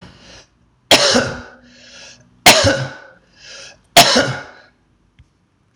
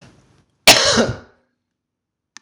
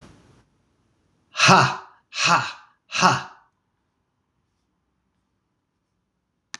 {"three_cough_length": "5.8 s", "three_cough_amplitude": 26028, "three_cough_signal_mean_std_ratio": 0.37, "cough_length": "2.4 s", "cough_amplitude": 26028, "cough_signal_mean_std_ratio": 0.32, "exhalation_length": "6.6 s", "exhalation_amplitude": 26027, "exhalation_signal_mean_std_ratio": 0.29, "survey_phase": "beta (2021-08-13 to 2022-03-07)", "age": "45-64", "gender": "Male", "wearing_mask": "No", "symptom_none": true, "smoker_status": "Ex-smoker", "respiratory_condition_asthma": false, "respiratory_condition_other": false, "recruitment_source": "REACT", "submission_delay": "1 day", "covid_test_result": "Positive", "covid_test_method": "RT-qPCR", "covid_ct_value": 34.0, "covid_ct_gene": "E gene", "influenza_a_test_result": "Negative", "influenza_b_test_result": "Negative"}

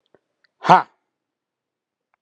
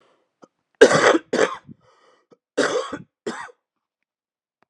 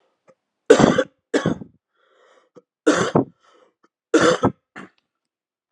{"exhalation_length": "2.2 s", "exhalation_amplitude": 32768, "exhalation_signal_mean_std_ratio": 0.18, "cough_length": "4.7 s", "cough_amplitude": 32768, "cough_signal_mean_std_ratio": 0.31, "three_cough_length": "5.7 s", "three_cough_amplitude": 32768, "three_cough_signal_mean_std_ratio": 0.33, "survey_phase": "alpha (2021-03-01 to 2021-08-12)", "age": "18-44", "gender": "Male", "wearing_mask": "No", "symptom_cough_any": true, "symptom_fatigue": true, "symptom_onset": "4 days", "smoker_status": "Never smoked", "respiratory_condition_asthma": false, "respiratory_condition_other": false, "recruitment_source": "Test and Trace", "submission_delay": "2 days", "covid_test_result": "Positive", "covid_test_method": "RT-qPCR", "covid_ct_value": 15.3, "covid_ct_gene": "ORF1ab gene", "covid_ct_mean": 17.1, "covid_viral_load": "2500000 copies/ml", "covid_viral_load_category": "High viral load (>1M copies/ml)"}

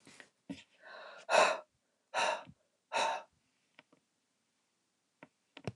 {"exhalation_length": "5.8 s", "exhalation_amplitude": 6946, "exhalation_signal_mean_std_ratio": 0.31, "survey_phase": "beta (2021-08-13 to 2022-03-07)", "age": "65+", "gender": "Female", "wearing_mask": "No", "symptom_none": true, "smoker_status": "Never smoked", "respiratory_condition_asthma": false, "respiratory_condition_other": false, "recruitment_source": "REACT", "submission_delay": "1 day", "covid_test_result": "Negative", "covid_test_method": "RT-qPCR", "influenza_a_test_result": "Negative", "influenza_b_test_result": "Negative"}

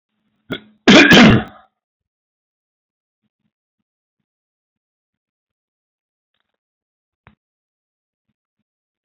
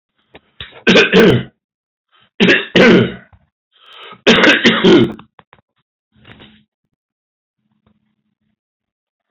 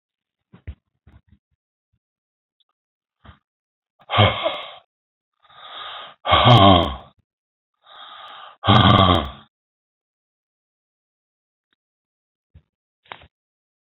{"cough_length": "9.0 s", "cough_amplitude": 32277, "cough_signal_mean_std_ratio": 0.21, "three_cough_length": "9.3 s", "three_cough_amplitude": 31604, "three_cough_signal_mean_std_ratio": 0.39, "exhalation_length": "13.8 s", "exhalation_amplitude": 29853, "exhalation_signal_mean_std_ratio": 0.28, "survey_phase": "beta (2021-08-13 to 2022-03-07)", "age": "65+", "gender": "Male", "wearing_mask": "No", "symptom_cough_any": true, "symptom_runny_or_blocked_nose": true, "symptom_onset": "6 days", "smoker_status": "Ex-smoker", "respiratory_condition_asthma": false, "respiratory_condition_other": false, "recruitment_source": "Test and Trace", "submission_delay": "2 days", "covid_test_result": "Positive", "covid_test_method": "RT-qPCR", "covid_ct_value": 22.8, "covid_ct_gene": "ORF1ab gene", "covid_ct_mean": 23.0, "covid_viral_load": "29000 copies/ml", "covid_viral_load_category": "Low viral load (10K-1M copies/ml)"}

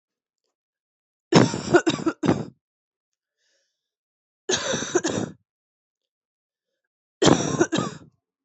{"three_cough_length": "8.4 s", "three_cough_amplitude": 26768, "three_cough_signal_mean_std_ratio": 0.34, "survey_phase": "beta (2021-08-13 to 2022-03-07)", "age": "18-44", "gender": "Female", "wearing_mask": "No", "symptom_cough_any": true, "symptom_new_continuous_cough": true, "symptom_runny_or_blocked_nose": true, "symptom_sore_throat": true, "symptom_fatigue": true, "symptom_headache": true, "symptom_change_to_sense_of_smell_or_taste": true, "symptom_loss_of_taste": true, "symptom_onset": "4 days", "smoker_status": "Never smoked", "respiratory_condition_asthma": false, "respiratory_condition_other": false, "recruitment_source": "Test and Trace", "submission_delay": "1 day", "covid_test_result": "Positive", "covid_test_method": "RT-qPCR", "covid_ct_value": 17.7, "covid_ct_gene": "N gene"}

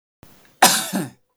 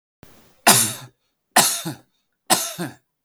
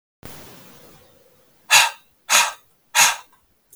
{"cough_length": "1.4 s", "cough_amplitude": 32768, "cough_signal_mean_std_ratio": 0.37, "three_cough_length": "3.2 s", "three_cough_amplitude": 32768, "three_cough_signal_mean_std_ratio": 0.37, "exhalation_length": "3.8 s", "exhalation_amplitude": 32768, "exhalation_signal_mean_std_ratio": 0.33, "survey_phase": "beta (2021-08-13 to 2022-03-07)", "age": "18-44", "gender": "Male", "wearing_mask": "No", "symptom_none": true, "smoker_status": "Never smoked", "respiratory_condition_asthma": false, "respiratory_condition_other": false, "recruitment_source": "REACT", "submission_delay": "1 day", "covid_test_result": "Negative", "covid_test_method": "RT-qPCR"}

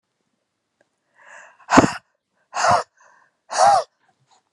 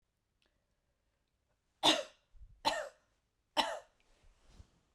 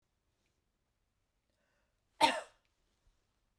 {"exhalation_length": "4.5 s", "exhalation_amplitude": 32768, "exhalation_signal_mean_std_ratio": 0.32, "three_cough_length": "4.9 s", "three_cough_amplitude": 6360, "three_cough_signal_mean_std_ratio": 0.26, "cough_length": "3.6 s", "cough_amplitude": 6457, "cough_signal_mean_std_ratio": 0.17, "survey_phase": "beta (2021-08-13 to 2022-03-07)", "age": "45-64", "gender": "Female", "wearing_mask": "No", "symptom_none": true, "smoker_status": "Prefer not to say", "respiratory_condition_asthma": false, "respiratory_condition_other": false, "recruitment_source": "REACT", "submission_delay": "2 days", "covid_test_result": "Negative", "covid_test_method": "RT-qPCR", "influenza_a_test_result": "Negative", "influenza_b_test_result": "Negative"}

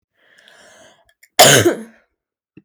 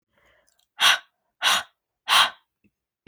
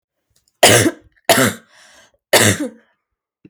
{"cough_length": "2.6 s", "cough_amplitude": 32768, "cough_signal_mean_std_ratio": 0.3, "exhalation_length": "3.1 s", "exhalation_amplitude": 20074, "exhalation_signal_mean_std_ratio": 0.34, "three_cough_length": "3.5 s", "three_cough_amplitude": 32768, "three_cough_signal_mean_std_ratio": 0.39, "survey_phase": "alpha (2021-03-01 to 2021-08-12)", "age": "18-44", "gender": "Female", "wearing_mask": "No", "symptom_cough_any": true, "symptom_shortness_of_breath": true, "symptom_fatigue": true, "symptom_fever_high_temperature": true, "symptom_headache": true, "symptom_change_to_sense_of_smell_or_taste": true, "symptom_loss_of_taste": true, "symptom_onset": "4 days", "smoker_status": "Never smoked", "respiratory_condition_asthma": false, "respiratory_condition_other": false, "recruitment_source": "Test and Trace", "submission_delay": "2 days", "covid_test_result": "Positive", "covid_test_method": "RT-qPCR", "covid_ct_value": 26.5, "covid_ct_gene": "ORF1ab gene"}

